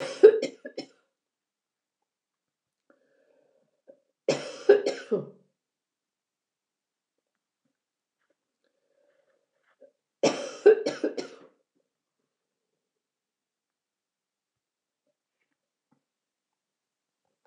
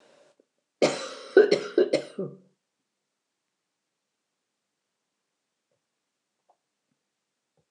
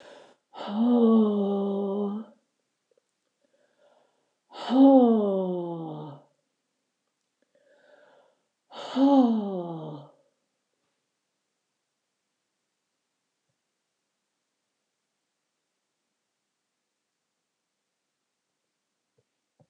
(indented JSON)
{
  "three_cough_length": "17.5 s",
  "three_cough_amplitude": 24822,
  "three_cough_signal_mean_std_ratio": 0.18,
  "cough_length": "7.7 s",
  "cough_amplitude": 20597,
  "cough_signal_mean_std_ratio": 0.22,
  "exhalation_length": "19.7 s",
  "exhalation_amplitude": 15786,
  "exhalation_signal_mean_std_ratio": 0.33,
  "survey_phase": "beta (2021-08-13 to 2022-03-07)",
  "age": "65+",
  "gender": "Female",
  "wearing_mask": "No",
  "symptom_none": true,
  "smoker_status": "Never smoked",
  "respiratory_condition_asthma": true,
  "respiratory_condition_other": false,
  "recruitment_source": "REACT",
  "submission_delay": "2 days",
  "covid_test_result": "Negative",
  "covid_test_method": "RT-qPCR",
  "influenza_a_test_result": "Negative",
  "influenza_b_test_result": "Negative"
}